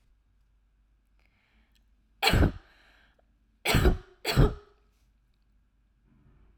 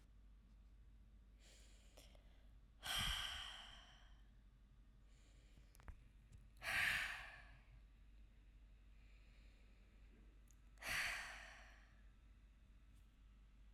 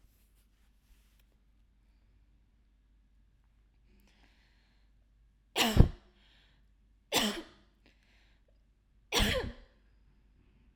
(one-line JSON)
{"cough_length": "6.6 s", "cough_amplitude": 14505, "cough_signal_mean_std_ratio": 0.29, "exhalation_length": "13.7 s", "exhalation_amplitude": 1108, "exhalation_signal_mean_std_ratio": 0.5, "three_cough_length": "10.8 s", "three_cough_amplitude": 18459, "three_cough_signal_mean_std_ratio": 0.22, "survey_phase": "alpha (2021-03-01 to 2021-08-12)", "age": "18-44", "gender": "Female", "wearing_mask": "No", "symptom_cough_any": true, "symptom_fatigue": true, "symptom_headache": true, "symptom_change_to_sense_of_smell_or_taste": true, "symptom_loss_of_taste": true, "smoker_status": "Never smoked", "respiratory_condition_asthma": false, "respiratory_condition_other": false, "recruitment_source": "Test and Trace", "submission_delay": "2 days", "covid_test_result": "Positive", "covid_test_method": "RT-qPCR", "covid_ct_value": 26.5, "covid_ct_gene": "N gene"}